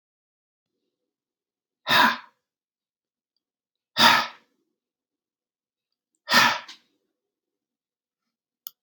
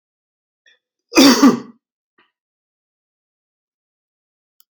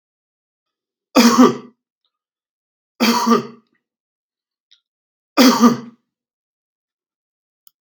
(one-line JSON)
{"exhalation_length": "8.8 s", "exhalation_amplitude": 23335, "exhalation_signal_mean_std_ratio": 0.24, "cough_length": "4.7 s", "cough_amplitude": 32768, "cough_signal_mean_std_ratio": 0.23, "three_cough_length": "7.8 s", "three_cough_amplitude": 32767, "three_cough_signal_mean_std_ratio": 0.31, "survey_phase": "beta (2021-08-13 to 2022-03-07)", "age": "65+", "gender": "Male", "wearing_mask": "No", "symptom_runny_or_blocked_nose": true, "symptom_change_to_sense_of_smell_or_taste": true, "symptom_loss_of_taste": true, "symptom_onset": "4 days", "smoker_status": "Ex-smoker", "respiratory_condition_asthma": false, "respiratory_condition_other": false, "recruitment_source": "Test and Trace", "submission_delay": "2 days", "covid_test_result": "Positive", "covid_test_method": "RT-qPCR", "covid_ct_value": 24.0, "covid_ct_gene": "ORF1ab gene"}